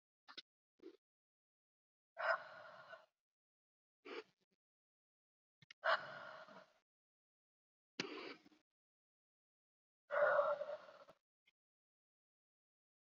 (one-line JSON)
{"exhalation_length": "13.1 s", "exhalation_amplitude": 2241, "exhalation_signal_mean_std_ratio": 0.26, "survey_phase": "beta (2021-08-13 to 2022-03-07)", "age": "45-64", "gender": "Female", "wearing_mask": "No", "symptom_cough_any": true, "symptom_fatigue": true, "symptom_other": true, "symptom_onset": "11 days", "smoker_status": "Never smoked", "respiratory_condition_asthma": false, "respiratory_condition_other": false, "recruitment_source": "REACT", "submission_delay": "1 day", "covid_test_result": "Negative", "covid_test_method": "RT-qPCR", "influenza_a_test_result": "Unknown/Void", "influenza_b_test_result": "Unknown/Void"}